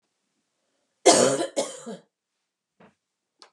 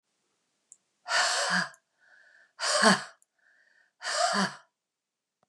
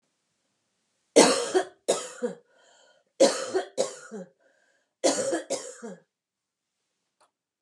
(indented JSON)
{
  "cough_length": "3.5 s",
  "cough_amplitude": 25026,
  "cough_signal_mean_std_ratio": 0.29,
  "exhalation_length": "5.5 s",
  "exhalation_amplitude": 16300,
  "exhalation_signal_mean_std_ratio": 0.41,
  "three_cough_length": "7.6 s",
  "three_cough_amplitude": 24477,
  "three_cough_signal_mean_std_ratio": 0.34,
  "survey_phase": "beta (2021-08-13 to 2022-03-07)",
  "age": "45-64",
  "gender": "Female",
  "wearing_mask": "No",
  "symptom_runny_or_blocked_nose": true,
  "symptom_onset": "3 days",
  "smoker_status": "Ex-smoker",
  "respiratory_condition_asthma": false,
  "respiratory_condition_other": false,
  "recruitment_source": "REACT",
  "submission_delay": "3 days",
  "covid_test_result": "Negative",
  "covid_test_method": "RT-qPCR",
  "influenza_a_test_result": "Negative",
  "influenza_b_test_result": "Negative"
}